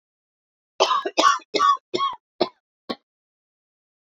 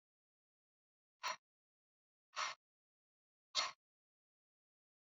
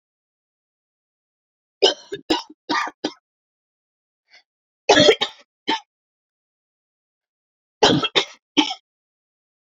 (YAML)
cough_length: 4.2 s
cough_amplitude: 26800
cough_signal_mean_std_ratio: 0.37
exhalation_length: 5.0 s
exhalation_amplitude: 2271
exhalation_signal_mean_std_ratio: 0.22
three_cough_length: 9.6 s
three_cough_amplitude: 29052
three_cough_signal_mean_std_ratio: 0.27
survey_phase: beta (2021-08-13 to 2022-03-07)
age: 45-64
gender: Female
wearing_mask: 'No'
symptom_cough_any: true
symptom_new_continuous_cough: true
symptom_runny_or_blocked_nose: true
symptom_fatigue: true
symptom_fever_high_temperature: true
symptom_headache: true
symptom_change_to_sense_of_smell_or_taste: true
symptom_loss_of_taste: true
symptom_onset: 2 days
smoker_status: Never smoked
respiratory_condition_asthma: true
respiratory_condition_other: false
recruitment_source: Test and Trace
submission_delay: 1 day
covid_test_result: Positive
covid_test_method: RT-qPCR
covid_ct_value: 19.9
covid_ct_gene: ORF1ab gene